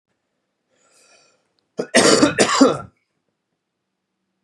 {"cough_length": "4.4 s", "cough_amplitude": 31564, "cough_signal_mean_std_ratio": 0.33, "survey_phase": "beta (2021-08-13 to 2022-03-07)", "age": "45-64", "gender": "Male", "wearing_mask": "No", "symptom_fatigue": true, "symptom_change_to_sense_of_smell_or_taste": true, "symptom_onset": "8 days", "smoker_status": "Ex-smoker", "respiratory_condition_asthma": false, "respiratory_condition_other": false, "recruitment_source": "Test and Trace", "submission_delay": "2 days", "covid_test_result": "Positive", "covid_test_method": "ePCR"}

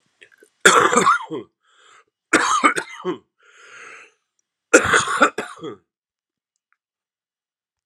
{"three_cough_length": "7.9 s", "three_cough_amplitude": 32768, "three_cough_signal_mean_std_ratio": 0.36, "survey_phase": "alpha (2021-03-01 to 2021-08-12)", "age": "45-64", "gender": "Male", "wearing_mask": "No", "symptom_cough_any": true, "symptom_new_continuous_cough": true, "symptom_shortness_of_breath": true, "symptom_fatigue": true, "symptom_headache": true, "symptom_change_to_sense_of_smell_or_taste": true, "symptom_loss_of_taste": true, "symptom_onset": "3 days", "smoker_status": "Never smoked", "respiratory_condition_asthma": false, "respiratory_condition_other": false, "recruitment_source": "Test and Trace", "submission_delay": "1 day", "covid_test_result": "Positive", "covid_test_method": "RT-qPCR", "covid_ct_value": 23.7, "covid_ct_gene": "ORF1ab gene"}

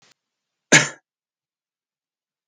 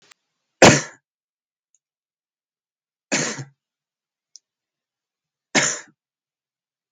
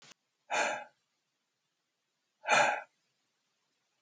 {"cough_length": "2.5 s", "cough_amplitude": 28051, "cough_signal_mean_std_ratio": 0.18, "three_cough_length": "6.9 s", "three_cough_amplitude": 32768, "three_cough_signal_mean_std_ratio": 0.2, "exhalation_length": "4.0 s", "exhalation_amplitude": 7222, "exhalation_signal_mean_std_ratio": 0.3, "survey_phase": "beta (2021-08-13 to 2022-03-07)", "age": "18-44", "gender": "Male", "wearing_mask": "No", "symptom_none": true, "symptom_onset": "6 days", "smoker_status": "Current smoker (1 to 10 cigarettes per day)", "respiratory_condition_asthma": false, "respiratory_condition_other": false, "recruitment_source": "Test and Trace", "submission_delay": "2 days", "covid_test_result": "Positive", "covid_test_method": "RT-qPCR", "covid_ct_value": 21.1, "covid_ct_gene": "ORF1ab gene", "covid_ct_mean": 21.5, "covid_viral_load": "88000 copies/ml", "covid_viral_load_category": "Low viral load (10K-1M copies/ml)"}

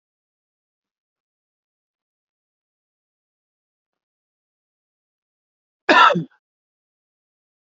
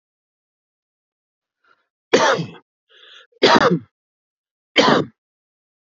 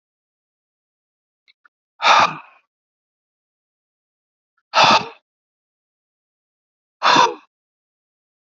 {"cough_length": "7.8 s", "cough_amplitude": 30500, "cough_signal_mean_std_ratio": 0.15, "three_cough_length": "6.0 s", "three_cough_amplitude": 31032, "three_cough_signal_mean_std_ratio": 0.31, "exhalation_length": "8.4 s", "exhalation_amplitude": 31482, "exhalation_signal_mean_std_ratio": 0.25, "survey_phase": "alpha (2021-03-01 to 2021-08-12)", "age": "45-64", "gender": "Male", "wearing_mask": "No", "symptom_shortness_of_breath": true, "symptom_fatigue": true, "symptom_change_to_sense_of_smell_or_taste": true, "symptom_loss_of_taste": true, "symptom_onset": "3 days", "smoker_status": "Ex-smoker", "respiratory_condition_asthma": false, "respiratory_condition_other": false, "recruitment_source": "Test and Trace", "submission_delay": "2 days", "covid_test_result": "Positive", "covid_test_method": "RT-qPCR", "covid_ct_value": 19.5, "covid_ct_gene": "N gene", "covid_ct_mean": 19.6, "covid_viral_load": "370000 copies/ml", "covid_viral_load_category": "Low viral load (10K-1M copies/ml)"}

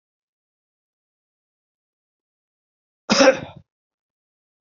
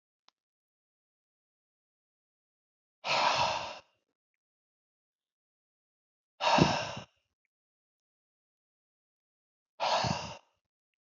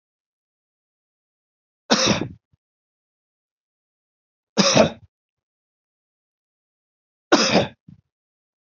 {"cough_length": "4.6 s", "cough_amplitude": 28057, "cough_signal_mean_std_ratio": 0.18, "exhalation_length": "11.1 s", "exhalation_amplitude": 12718, "exhalation_signal_mean_std_ratio": 0.29, "three_cough_length": "8.6 s", "three_cough_amplitude": 31537, "three_cough_signal_mean_std_ratio": 0.26, "survey_phase": "beta (2021-08-13 to 2022-03-07)", "age": "45-64", "gender": "Male", "wearing_mask": "No", "symptom_none": true, "smoker_status": "Never smoked", "respiratory_condition_asthma": false, "respiratory_condition_other": false, "recruitment_source": "REACT", "submission_delay": "2 days", "covid_test_result": "Negative", "covid_test_method": "RT-qPCR"}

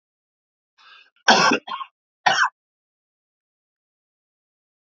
{"three_cough_length": "4.9 s", "three_cough_amplitude": 30816, "three_cough_signal_mean_std_ratio": 0.27, "survey_phase": "alpha (2021-03-01 to 2021-08-12)", "age": "45-64", "gender": "Male", "wearing_mask": "No", "symptom_cough_any": true, "symptom_headache": true, "symptom_onset": "7 days", "smoker_status": "Never smoked", "respiratory_condition_asthma": false, "respiratory_condition_other": false, "recruitment_source": "Test and Trace", "submission_delay": "2 days", "covid_test_result": "Positive", "covid_test_method": "RT-qPCR", "covid_ct_value": 15.3, "covid_ct_gene": "ORF1ab gene", "covid_ct_mean": 15.7, "covid_viral_load": "7300000 copies/ml", "covid_viral_load_category": "High viral load (>1M copies/ml)"}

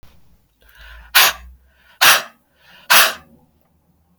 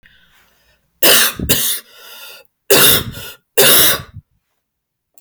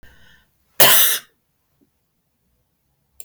{"exhalation_length": "4.2 s", "exhalation_amplitude": 32768, "exhalation_signal_mean_std_ratio": 0.32, "three_cough_length": "5.2 s", "three_cough_amplitude": 32768, "three_cough_signal_mean_std_ratio": 0.45, "cough_length": "3.2 s", "cough_amplitude": 32768, "cough_signal_mean_std_ratio": 0.28, "survey_phase": "beta (2021-08-13 to 2022-03-07)", "age": "45-64", "gender": "Female", "wearing_mask": "No", "symptom_none": true, "smoker_status": "Ex-smoker", "respiratory_condition_asthma": false, "respiratory_condition_other": false, "recruitment_source": "REACT", "submission_delay": "1 day", "covid_test_result": "Negative", "covid_test_method": "RT-qPCR", "influenza_a_test_result": "Negative", "influenza_b_test_result": "Negative"}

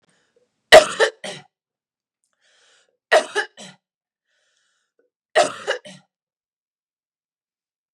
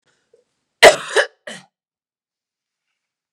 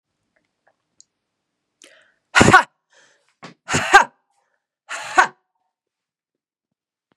{"three_cough_length": "7.9 s", "three_cough_amplitude": 32768, "three_cough_signal_mean_std_ratio": 0.2, "cough_length": "3.3 s", "cough_amplitude": 32768, "cough_signal_mean_std_ratio": 0.2, "exhalation_length": "7.2 s", "exhalation_amplitude": 32768, "exhalation_signal_mean_std_ratio": 0.23, "survey_phase": "beta (2021-08-13 to 2022-03-07)", "age": "18-44", "gender": "Female", "wearing_mask": "No", "symptom_fatigue": true, "symptom_headache": true, "symptom_other": true, "symptom_onset": "4 days", "smoker_status": "Never smoked", "respiratory_condition_asthma": false, "respiratory_condition_other": false, "recruitment_source": "Test and Trace", "submission_delay": "2 days", "covid_test_result": "Positive", "covid_test_method": "ePCR"}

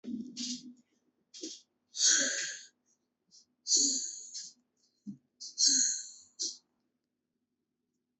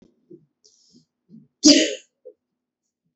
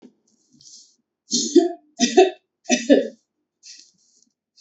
{"exhalation_length": "8.2 s", "exhalation_amplitude": 8419, "exhalation_signal_mean_std_ratio": 0.4, "cough_length": "3.2 s", "cough_amplitude": 31662, "cough_signal_mean_std_ratio": 0.23, "three_cough_length": "4.6 s", "three_cough_amplitude": 27545, "three_cough_signal_mean_std_ratio": 0.33, "survey_phase": "beta (2021-08-13 to 2022-03-07)", "age": "45-64", "gender": "Female", "wearing_mask": "No", "symptom_cough_any": true, "symptom_runny_or_blocked_nose": true, "symptom_fatigue": true, "symptom_change_to_sense_of_smell_or_taste": true, "smoker_status": "Ex-smoker", "respiratory_condition_asthma": false, "respiratory_condition_other": false, "recruitment_source": "Test and Trace", "submission_delay": "1 day", "covid_test_result": "Positive", "covid_test_method": "LFT"}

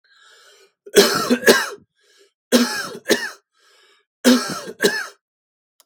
{"three_cough_length": "5.9 s", "three_cough_amplitude": 32768, "three_cough_signal_mean_std_ratio": 0.4, "survey_phase": "beta (2021-08-13 to 2022-03-07)", "age": "18-44", "gender": "Male", "wearing_mask": "No", "symptom_none": true, "smoker_status": "Never smoked", "respiratory_condition_asthma": false, "respiratory_condition_other": false, "recruitment_source": "REACT", "submission_delay": "4 days", "covid_test_result": "Negative", "covid_test_method": "RT-qPCR", "influenza_a_test_result": "Negative", "influenza_b_test_result": "Negative"}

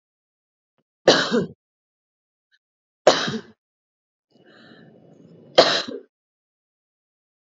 {"three_cough_length": "7.5 s", "three_cough_amplitude": 29219, "three_cough_signal_mean_std_ratio": 0.25, "survey_phase": "beta (2021-08-13 to 2022-03-07)", "age": "18-44", "gender": "Female", "wearing_mask": "No", "symptom_cough_any": true, "symptom_runny_or_blocked_nose": true, "symptom_fatigue": true, "symptom_headache": true, "smoker_status": "Never smoked", "respiratory_condition_asthma": false, "respiratory_condition_other": false, "recruitment_source": "Test and Trace", "submission_delay": "1 day", "covid_test_result": "Positive", "covid_test_method": "RT-qPCR", "covid_ct_value": 30.6, "covid_ct_gene": "ORF1ab gene"}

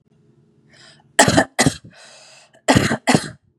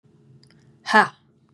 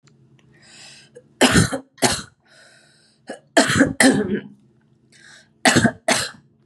{"cough_length": "3.6 s", "cough_amplitude": 32768, "cough_signal_mean_std_ratio": 0.37, "exhalation_length": "1.5 s", "exhalation_amplitude": 30134, "exhalation_signal_mean_std_ratio": 0.25, "three_cough_length": "6.7 s", "three_cough_amplitude": 32694, "three_cough_signal_mean_std_ratio": 0.4, "survey_phase": "beta (2021-08-13 to 2022-03-07)", "age": "18-44", "gender": "Female", "wearing_mask": "No", "symptom_sore_throat": true, "symptom_fatigue": true, "symptom_headache": true, "symptom_change_to_sense_of_smell_or_taste": true, "symptom_onset": "6 days", "smoker_status": "Never smoked", "respiratory_condition_asthma": false, "respiratory_condition_other": false, "recruitment_source": "Test and Trace", "submission_delay": "2 days", "covid_test_result": "Positive", "covid_test_method": "RT-qPCR", "covid_ct_value": 22.6, "covid_ct_gene": "ORF1ab gene", "covid_ct_mean": 23.0, "covid_viral_load": "28000 copies/ml", "covid_viral_load_category": "Low viral load (10K-1M copies/ml)"}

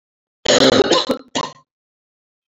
{"cough_length": "2.5 s", "cough_amplitude": 29959, "cough_signal_mean_std_ratio": 0.43, "survey_phase": "beta (2021-08-13 to 2022-03-07)", "age": "45-64", "gender": "Female", "wearing_mask": "No", "symptom_cough_any": true, "symptom_runny_or_blocked_nose": true, "symptom_fatigue": true, "symptom_headache": true, "symptom_onset": "5 days", "smoker_status": "Ex-smoker", "respiratory_condition_asthma": false, "respiratory_condition_other": false, "recruitment_source": "Test and Trace", "submission_delay": "1 day", "covid_test_result": "Positive", "covid_test_method": "RT-qPCR"}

